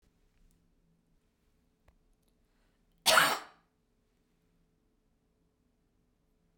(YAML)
cough_length: 6.6 s
cough_amplitude: 12567
cough_signal_mean_std_ratio: 0.18
survey_phase: beta (2021-08-13 to 2022-03-07)
age: 65+
gender: Female
wearing_mask: 'No'
symptom_none: true
smoker_status: Never smoked
respiratory_condition_asthma: false
respiratory_condition_other: false
recruitment_source: REACT
submission_delay: 2 days
covid_test_result: Negative
covid_test_method: RT-qPCR